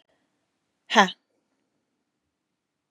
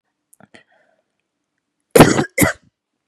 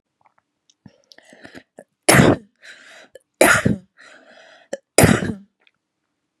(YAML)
exhalation_length: 2.9 s
exhalation_amplitude: 26715
exhalation_signal_mean_std_ratio: 0.17
cough_length: 3.1 s
cough_amplitude: 32768
cough_signal_mean_std_ratio: 0.26
three_cough_length: 6.4 s
three_cough_amplitude: 32768
three_cough_signal_mean_std_ratio: 0.3
survey_phase: beta (2021-08-13 to 2022-03-07)
age: 18-44
gender: Female
wearing_mask: 'No'
symptom_runny_or_blocked_nose: true
symptom_onset: 13 days
smoker_status: Never smoked
respiratory_condition_asthma: false
respiratory_condition_other: false
recruitment_source: REACT
submission_delay: 1 day
covid_test_result: Negative
covid_test_method: RT-qPCR
influenza_a_test_result: Negative
influenza_b_test_result: Negative